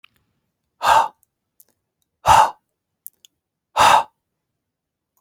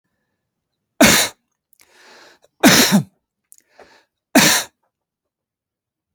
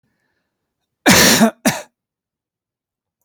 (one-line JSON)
{"exhalation_length": "5.2 s", "exhalation_amplitude": 28610, "exhalation_signal_mean_std_ratio": 0.3, "three_cough_length": "6.1 s", "three_cough_amplitude": 32767, "three_cough_signal_mean_std_ratio": 0.31, "cough_length": "3.2 s", "cough_amplitude": 32768, "cough_signal_mean_std_ratio": 0.34, "survey_phase": "alpha (2021-03-01 to 2021-08-12)", "age": "45-64", "gender": "Male", "wearing_mask": "No", "symptom_none": true, "smoker_status": "Never smoked", "respiratory_condition_asthma": false, "respiratory_condition_other": false, "recruitment_source": "REACT", "submission_delay": "5 days", "covid_test_result": "Negative", "covid_test_method": "RT-qPCR"}